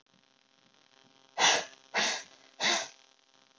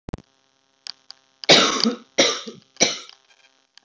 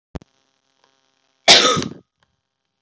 {"exhalation_length": "3.6 s", "exhalation_amplitude": 10415, "exhalation_signal_mean_std_ratio": 0.37, "three_cough_length": "3.8 s", "three_cough_amplitude": 29722, "three_cough_signal_mean_std_ratio": 0.34, "cough_length": "2.8 s", "cough_amplitude": 32768, "cough_signal_mean_std_ratio": 0.27, "survey_phase": "beta (2021-08-13 to 2022-03-07)", "age": "18-44", "gender": "Female", "wearing_mask": "No", "symptom_cough_any": true, "symptom_new_continuous_cough": true, "symptom_runny_or_blocked_nose": true, "symptom_shortness_of_breath": true, "symptom_abdominal_pain": true, "symptom_fatigue": true, "symptom_fever_high_temperature": true, "symptom_other": true, "symptom_onset": "3 days", "smoker_status": "Never smoked", "respiratory_condition_asthma": false, "respiratory_condition_other": false, "recruitment_source": "Test and Trace", "submission_delay": "2 days", "covid_test_result": "Positive", "covid_test_method": "RT-qPCR", "covid_ct_value": 22.4, "covid_ct_gene": "ORF1ab gene", "covid_ct_mean": 25.1, "covid_viral_load": "5700 copies/ml", "covid_viral_load_category": "Minimal viral load (< 10K copies/ml)"}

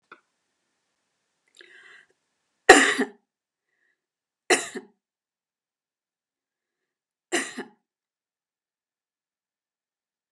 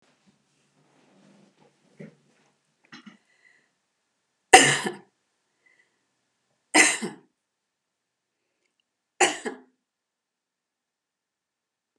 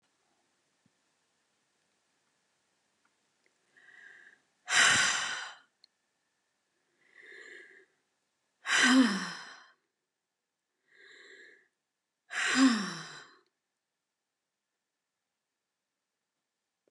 {"cough_length": "10.3 s", "cough_amplitude": 32768, "cough_signal_mean_std_ratio": 0.16, "three_cough_length": "12.0 s", "three_cough_amplitude": 32768, "three_cough_signal_mean_std_ratio": 0.18, "exhalation_length": "16.9 s", "exhalation_amplitude": 9225, "exhalation_signal_mean_std_ratio": 0.27, "survey_phase": "beta (2021-08-13 to 2022-03-07)", "age": "65+", "gender": "Female", "wearing_mask": "No", "symptom_none": true, "smoker_status": "Never smoked", "respiratory_condition_asthma": false, "respiratory_condition_other": false, "recruitment_source": "REACT", "submission_delay": "2 days", "covid_test_result": "Negative", "covid_test_method": "RT-qPCR", "influenza_a_test_result": "Negative", "influenza_b_test_result": "Negative"}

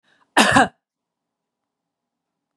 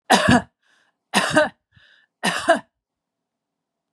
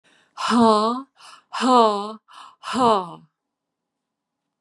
{"cough_length": "2.6 s", "cough_amplitude": 32675, "cough_signal_mean_std_ratio": 0.26, "three_cough_length": "3.9 s", "three_cough_amplitude": 30675, "three_cough_signal_mean_std_ratio": 0.37, "exhalation_length": "4.6 s", "exhalation_amplitude": 26479, "exhalation_signal_mean_std_ratio": 0.45, "survey_phase": "beta (2021-08-13 to 2022-03-07)", "age": "65+", "gender": "Female", "wearing_mask": "No", "symptom_none": true, "smoker_status": "Ex-smoker", "respiratory_condition_asthma": false, "respiratory_condition_other": false, "recruitment_source": "REACT", "submission_delay": "2 days", "covid_test_result": "Negative", "covid_test_method": "RT-qPCR", "influenza_a_test_result": "Negative", "influenza_b_test_result": "Negative"}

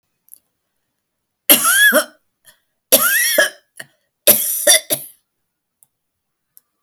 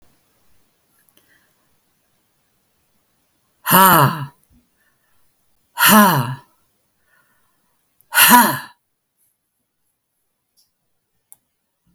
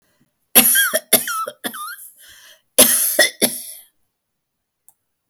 {"three_cough_length": "6.8 s", "three_cough_amplitude": 32768, "three_cough_signal_mean_std_ratio": 0.38, "exhalation_length": "11.9 s", "exhalation_amplitude": 32768, "exhalation_signal_mean_std_ratio": 0.28, "cough_length": "5.3 s", "cough_amplitude": 32768, "cough_signal_mean_std_ratio": 0.4, "survey_phase": "alpha (2021-03-01 to 2021-08-12)", "age": "65+", "gender": "Female", "wearing_mask": "No", "symptom_cough_any": true, "smoker_status": "Ex-smoker", "respiratory_condition_asthma": false, "respiratory_condition_other": false, "recruitment_source": "REACT", "submission_delay": "1 day", "covid_test_result": "Negative", "covid_test_method": "RT-qPCR"}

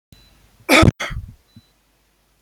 {"cough_length": "2.4 s", "cough_amplitude": 30113, "cough_signal_mean_std_ratio": 0.28, "survey_phase": "beta (2021-08-13 to 2022-03-07)", "age": "65+", "gender": "Male", "wearing_mask": "No", "symptom_none": true, "smoker_status": "Ex-smoker", "respiratory_condition_asthma": false, "respiratory_condition_other": false, "recruitment_source": "REACT", "submission_delay": "1 day", "covid_test_result": "Negative", "covid_test_method": "RT-qPCR", "influenza_a_test_result": "Negative", "influenza_b_test_result": "Negative"}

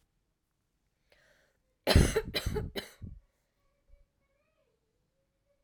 {"cough_length": "5.6 s", "cough_amplitude": 10790, "cough_signal_mean_std_ratio": 0.25, "survey_phase": "alpha (2021-03-01 to 2021-08-12)", "age": "18-44", "gender": "Female", "wearing_mask": "No", "symptom_shortness_of_breath": true, "symptom_abdominal_pain": true, "symptom_fatigue": true, "symptom_fever_high_temperature": true, "symptom_headache": true, "symptom_change_to_sense_of_smell_or_taste": true, "symptom_loss_of_taste": true, "symptom_onset": "3 days", "smoker_status": "Never smoked", "respiratory_condition_asthma": false, "respiratory_condition_other": false, "recruitment_source": "Test and Trace", "submission_delay": "2 days", "covid_test_result": "Positive", "covid_test_method": "RT-qPCR", "covid_ct_value": 16.5, "covid_ct_gene": "ORF1ab gene", "covid_ct_mean": 16.7, "covid_viral_load": "3300000 copies/ml", "covid_viral_load_category": "High viral load (>1M copies/ml)"}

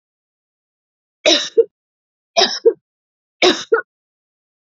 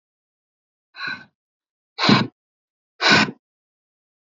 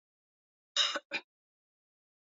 {"three_cough_length": "4.7 s", "three_cough_amplitude": 32034, "three_cough_signal_mean_std_ratio": 0.31, "exhalation_length": "4.3 s", "exhalation_amplitude": 26561, "exhalation_signal_mean_std_ratio": 0.29, "cough_length": "2.2 s", "cough_amplitude": 4642, "cough_signal_mean_std_ratio": 0.27, "survey_phase": "beta (2021-08-13 to 2022-03-07)", "age": "65+", "gender": "Female", "wearing_mask": "No", "symptom_none": true, "smoker_status": "Never smoked", "respiratory_condition_asthma": false, "respiratory_condition_other": false, "recruitment_source": "REACT", "submission_delay": "1 day", "covid_test_result": "Negative", "covid_test_method": "RT-qPCR", "influenza_a_test_result": "Negative", "influenza_b_test_result": "Negative"}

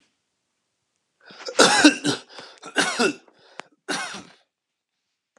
{"cough_length": "5.4 s", "cough_amplitude": 32767, "cough_signal_mean_std_ratio": 0.33, "survey_phase": "alpha (2021-03-01 to 2021-08-12)", "age": "45-64", "gender": "Male", "wearing_mask": "No", "symptom_none": true, "smoker_status": "Ex-smoker", "respiratory_condition_asthma": false, "respiratory_condition_other": false, "recruitment_source": "REACT", "submission_delay": "1 day", "covid_test_result": "Negative", "covid_test_method": "RT-qPCR"}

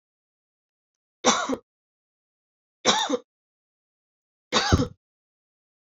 {"three_cough_length": "5.9 s", "three_cough_amplitude": 19862, "three_cough_signal_mean_std_ratio": 0.3, "survey_phase": "beta (2021-08-13 to 2022-03-07)", "age": "18-44", "gender": "Female", "wearing_mask": "No", "symptom_cough_any": true, "symptom_runny_or_blocked_nose": true, "symptom_fatigue": true, "symptom_headache": true, "symptom_onset": "3 days", "smoker_status": "Never smoked", "respiratory_condition_asthma": false, "respiratory_condition_other": false, "recruitment_source": "REACT", "submission_delay": "1 day", "covid_test_result": "Negative", "covid_test_method": "RT-qPCR"}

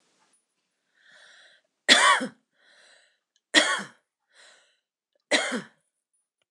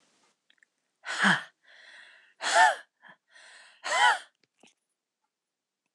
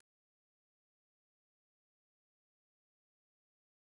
{"three_cough_length": "6.5 s", "three_cough_amplitude": 25594, "three_cough_signal_mean_std_ratio": 0.28, "exhalation_length": "5.9 s", "exhalation_amplitude": 13298, "exhalation_signal_mean_std_ratio": 0.31, "cough_length": "4.0 s", "cough_amplitude": 41, "cough_signal_mean_std_ratio": 0.02, "survey_phase": "beta (2021-08-13 to 2022-03-07)", "age": "45-64", "gender": "Female", "wearing_mask": "No", "symptom_cough_any": true, "symptom_shortness_of_breath": true, "symptom_fatigue": true, "symptom_onset": "12 days", "smoker_status": "Never smoked", "respiratory_condition_asthma": true, "respiratory_condition_other": false, "recruitment_source": "REACT", "submission_delay": "2 days", "covid_test_result": "Negative", "covid_test_method": "RT-qPCR", "influenza_a_test_result": "Negative", "influenza_b_test_result": "Negative"}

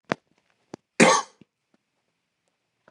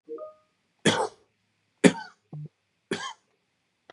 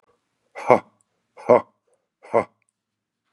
{"cough_length": "2.9 s", "cough_amplitude": 26666, "cough_signal_mean_std_ratio": 0.22, "three_cough_length": "3.9 s", "three_cough_amplitude": 28090, "three_cough_signal_mean_std_ratio": 0.25, "exhalation_length": "3.3 s", "exhalation_amplitude": 31431, "exhalation_signal_mean_std_ratio": 0.22, "survey_phase": "beta (2021-08-13 to 2022-03-07)", "age": "45-64", "gender": "Male", "wearing_mask": "No", "symptom_fatigue": true, "smoker_status": "Ex-smoker", "respiratory_condition_asthma": false, "respiratory_condition_other": false, "recruitment_source": "Test and Trace", "submission_delay": "2 days", "covid_test_result": "Positive", "covid_test_method": "LFT"}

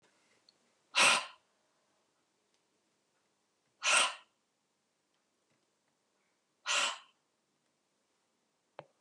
{"exhalation_length": "9.0 s", "exhalation_amplitude": 6618, "exhalation_signal_mean_std_ratio": 0.24, "survey_phase": "beta (2021-08-13 to 2022-03-07)", "age": "45-64", "gender": "Female", "wearing_mask": "No", "symptom_cough_any": true, "symptom_shortness_of_breath": true, "smoker_status": "Never smoked", "respiratory_condition_asthma": false, "respiratory_condition_other": true, "recruitment_source": "REACT", "submission_delay": "1 day", "covid_test_result": "Negative", "covid_test_method": "RT-qPCR"}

